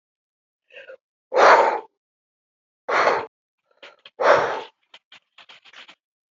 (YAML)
exhalation_length: 6.3 s
exhalation_amplitude: 31855
exhalation_signal_mean_std_ratio: 0.33
survey_phase: alpha (2021-03-01 to 2021-08-12)
age: 65+
gender: Female
wearing_mask: 'No'
symptom_none: true
symptom_onset: 12 days
smoker_status: Ex-smoker
respiratory_condition_asthma: false
respiratory_condition_other: false
recruitment_source: REACT
submission_delay: 3 days
covid_test_result: Negative
covid_test_method: RT-qPCR